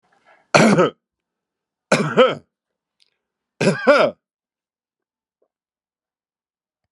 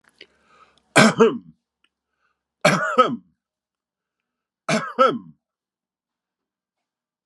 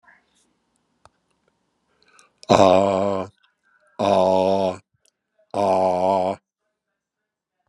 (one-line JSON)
{"cough_length": "6.9 s", "cough_amplitude": 32616, "cough_signal_mean_std_ratio": 0.32, "three_cough_length": "7.3 s", "three_cough_amplitude": 32672, "three_cough_signal_mean_std_ratio": 0.3, "exhalation_length": "7.7 s", "exhalation_amplitude": 32768, "exhalation_signal_mean_std_ratio": 0.41, "survey_phase": "beta (2021-08-13 to 2022-03-07)", "age": "65+", "gender": "Male", "wearing_mask": "No", "symptom_none": true, "smoker_status": "Ex-smoker", "respiratory_condition_asthma": false, "respiratory_condition_other": false, "recruitment_source": "REACT", "submission_delay": "2 days", "covid_test_result": "Negative", "covid_test_method": "RT-qPCR", "influenza_a_test_result": "Unknown/Void", "influenza_b_test_result": "Unknown/Void"}